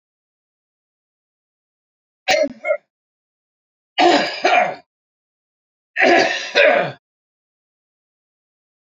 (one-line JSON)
{"three_cough_length": "9.0 s", "three_cough_amplitude": 29145, "three_cough_signal_mean_std_ratio": 0.36, "survey_phase": "beta (2021-08-13 to 2022-03-07)", "age": "65+", "gender": "Male", "wearing_mask": "No", "symptom_none": true, "smoker_status": "Never smoked", "respiratory_condition_asthma": false, "respiratory_condition_other": false, "recruitment_source": "REACT", "submission_delay": "3 days", "covid_test_result": "Negative", "covid_test_method": "RT-qPCR", "influenza_a_test_result": "Negative", "influenza_b_test_result": "Negative"}